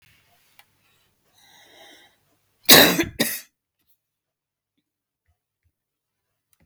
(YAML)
cough_length: 6.7 s
cough_amplitude: 32768
cough_signal_mean_std_ratio: 0.19
survey_phase: beta (2021-08-13 to 2022-03-07)
age: 45-64
gender: Female
wearing_mask: 'No'
symptom_runny_or_blocked_nose: true
symptom_onset: 12 days
smoker_status: Never smoked
respiratory_condition_asthma: false
respiratory_condition_other: false
recruitment_source: REACT
submission_delay: 2 days
covid_test_result: Negative
covid_test_method: RT-qPCR
influenza_a_test_result: Negative
influenza_b_test_result: Negative